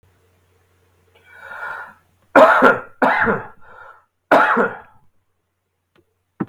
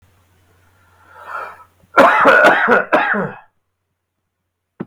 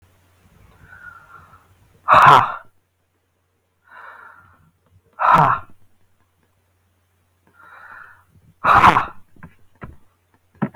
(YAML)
three_cough_length: 6.5 s
three_cough_amplitude: 32768
three_cough_signal_mean_std_ratio: 0.36
cough_length: 4.9 s
cough_amplitude: 32768
cough_signal_mean_std_ratio: 0.44
exhalation_length: 10.8 s
exhalation_amplitude: 32768
exhalation_signal_mean_std_ratio: 0.28
survey_phase: beta (2021-08-13 to 2022-03-07)
age: 45-64
gender: Male
wearing_mask: 'No'
symptom_none: true
smoker_status: Ex-smoker
respiratory_condition_asthma: false
respiratory_condition_other: false
recruitment_source: REACT
submission_delay: 3 days
covid_test_result: Negative
covid_test_method: RT-qPCR
influenza_a_test_result: Negative
influenza_b_test_result: Negative